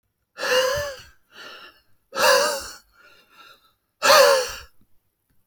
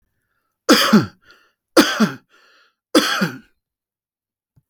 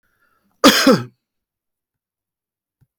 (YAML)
exhalation_length: 5.5 s
exhalation_amplitude: 28010
exhalation_signal_mean_std_ratio: 0.41
three_cough_length: 4.7 s
three_cough_amplitude: 30821
three_cough_signal_mean_std_ratio: 0.35
cough_length: 3.0 s
cough_amplitude: 32767
cough_signal_mean_std_ratio: 0.26
survey_phase: alpha (2021-03-01 to 2021-08-12)
age: 18-44
gender: Male
wearing_mask: 'No'
symptom_none: true
smoker_status: Never smoked
respiratory_condition_asthma: false
respiratory_condition_other: false
recruitment_source: REACT
submission_delay: 1 day
covid_test_result: Negative
covid_test_method: RT-qPCR